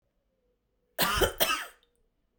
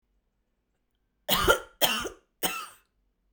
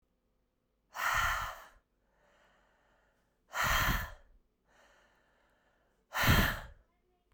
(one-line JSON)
{"cough_length": "2.4 s", "cough_amplitude": 9942, "cough_signal_mean_std_ratio": 0.38, "three_cough_length": "3.3 s", "three_cough_amplitude": 16890, "three_cough_signal_mean_std_ratio": 0.35, "exhalation_length": "7.3 s", "exhalation_amplitude": 6880, "exhalation_signal_mean_std_ratio": 0.37, "survey_phase": "beta (2021-08-13 to 2022-03-07)", "age": "18-44", "gender": "Female", "wearing_mask": "No", "symptom_runny_or_blocked_nose": true, "symptom_fatigue": true, "symptom_fever_high_temperature": true, "symptom_headache": true, "symptom_change_to_sense_of_smell_or_taste": true, "symptom_loss_of_taste": true, "symptom_onset": "2 days", "smoker_status": "Never smoked", "respiratory_condition_asthma": false, "respiratory_condition_other": false, "recruitment_source": "Test and Trace", "submission_delay": "2 days", "covid_test_result": "Positive", "covid_test_method": "RT-qPCR", "covid_ct_value": 22.7, "covid_ct_gene": "ORF1ab gene", "covid_ct_mean": 23.4, "covid_viral_load": "21000 copies/ml", "covid_viral_load_category": "Low viral load (10K-1M copies/ml)"}